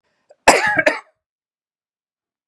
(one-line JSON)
{"cough_length": "2.5 s", "cough_amplitude": 32768, "cough_signal_mean_std_ratio": 0.3, "survey_phase": "beta (2021-08-13 to 2022-03-07)", "age": "45-64", "gender": "Male", "wearing_mask": "No", "symptom_cough_any": true, "symptom_runny_or_blocked_nose": true, "symptom_sore_throat": true, "symptom_fatigue": true, "symptom_fever_high_temperature": true, "symptom_headache": true, "symptom_onset": "2 days", "smoker_status": "Never smoked", "respiratory_condition_asthma": false, "respiratory_condition_other": false, "recruitment_source": "Test and Trace", "submission_delay": "2 days", "covid_test_result": "Positive", "covid_test_method": "RT-qPCR", "covid_ct_value": 18.0, "covid_ct_gene": "ORF1ab gene", "covid_ct_mean": 18.3, "covid_viral_load": "990000 copies/ml", "covid_viral_load_category": "Low viral load (10K-1M copies/ml)"}